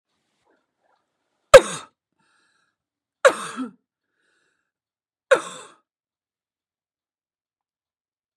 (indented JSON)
{
  "three_cough_length": "8.4 s",
  "three_cough_amplitude": 32768,
  "three_cough_signal_mean_std_ratio": 0.14,
  "survey_phase": "beta (2021-08-13 to 2022-03-07)",
  "age": "45-64",
  "gender": "Female",
  "wearing_mask": "No",
  "symptom_cough_any": true,
  "symptom_change_to_sense_of_smell_or_taste": true,
  "symptom_loss_of_taste": true,
  "smoker_status": "Ex-smoker",
  "respiratory_condition_asthma": false,
  "respiratory_condition_other": false,
  "recruitment_source": "Test and Trace",
  "submission_delay": "2 days",
  "covid_test_result": "Positive",
  "covid_test_method": "RT-qPCR"
}